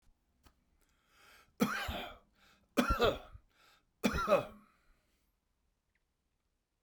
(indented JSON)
{
  "three_cough_length": "6.8 s",
  "three_cough_amplitude": 6334,
  "three_cough_signal_mean_std_ratio": 0.32,
  "survey_phase": "beta (2021-08-13 to 2022-03-07)",
  "age": "65+",
  "gender": "Male",
  "wearing_mask": "No",
  "symptom_none": true,
  "smoker_status": "Never smoked",
  "respiratory_condition_asthma": false,
  "respiratory_condition_other": false,
  "recruitment_source": "REACT",
  "submission_delay": "2 days",
  "covid_test_result": "Negative",
  "covid_test_method": "RT-qPCR"
}